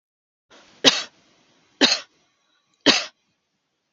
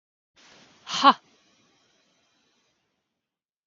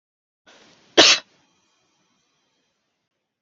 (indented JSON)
{
  "three_cough_length": "3.9 s",
  "three_cough_amplitude": 32768,
  "three_cough_signal_mean_std_ratio": 0.26,
  "exhalation_length": "3.7 s",
  "exhalation_amplitude": 23982,
  "exhalation_signal_mean_std_ratio": 0.16,
  "cough_length": "3.4 s",
  "cough_amplitude": 32768,
  "cough_signal_mean_std_ratio": 0.19,
  "survey_phase": "beta (2021-08-13 to 2022-03-07)",
  "age": "45-64",
  "gender": "Female",
  "wearing_mask": "No",
  "symptom_none": true,
  "smoker_status": "Never smoked",
  "respiratory_condition_asthma": false,
  "respiratory_condition_other": false,
  "recruitment_source": "REACT",
  "submission_delay": "1 day",
  "covid_test_result": "Negative",
  "covid_test_method": "RT-qPCR",
  "influenza_a_test_result": "Negative",
  "influenza_b_test_result": "Negative"
}